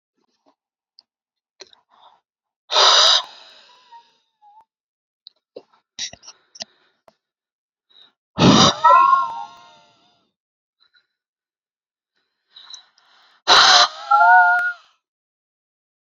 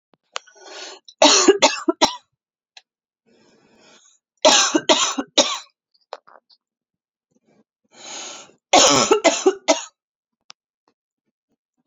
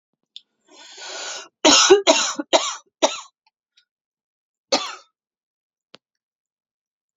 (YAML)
exhalation_length: 16.1 s
exhalation_amplitude: 32767
exhalation_signal_mean_std_ratio: 0.32
three_cough_length: 11.9 s
three_cough_amplitude: 32767
three_cough_signal_mean_std_ratio: 0.34
cough_length: 7.2 s
cough_amplitude: 31184
cough_signal_mean_std_ratio: 0.3
survey_phase: alpha (2021-03-01 to 2021-08-12)
age: 18-44
gender: Female
wearing_mask: 'No'
symptom_none: true
smoker_status: Never smoked
respiratory_condition_asthma: false
respiratory_condition_other: false
recruitment_source: REACT
submission_delay: 2 days
covid_test_result: Negative
covid_test_method: RT-qPCR